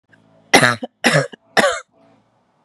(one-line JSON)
{"three_cough_length": "2.6 s", "three_cough_amplitude": 32768, "three_cough_signal_mean_std_ratio": 0.38, "survey_phase": "beta (2021-08-13 to 2022-03-07)", "age": "18-44", "gender": "Female", "wearing_mask": "No", "symptom_none": true, "smoker_status": "Ex-smoker", "respiratory_condition_asthma": false, "respiratory_condition_other": false, "recruitment_source": "REACT", "submission_delay": "0 days", "covid_test_result": "Negative", "covid_test_method": "RT-qPCR", "influenza_a_test_result": "Unknown/Void", "influenza_b_test_result": "Unknown/Void"}